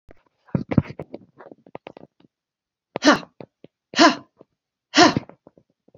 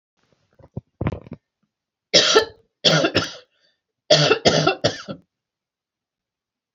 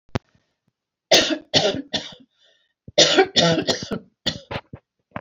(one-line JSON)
{"exhalation_length": "6.0 s", "exhalation_amplitude": 27860, "exhalation_signal_mean_std_ratio": 0.26, "three_cough_length": "6.7 s", "three_cough_amplitude": 30542, "three_cough_signal_mean_std_ratio": 0.37, "cough_length": "5.2 s", "cough_amplitude": 30319, "cough_signal_mean_std_ratio": 0.42, "survey_phase": "beta (2021-08-13 to 2022-03-07)", "age": "65+", "gender": "Female", "wearing_mask": "No", "symptom_none": true, "smoker_status": "Never smoked", "respiratory_condition_asthma": false, "respiratory_condition_other": false, "recruitment_source": "REACT", "submission_delay": "5 days", "covid_test_result": "Negative", "covid_test_method": "RT-qPCR", "influenza_a_test_result": "Negative", "influenza_b_test_result": "Negative"}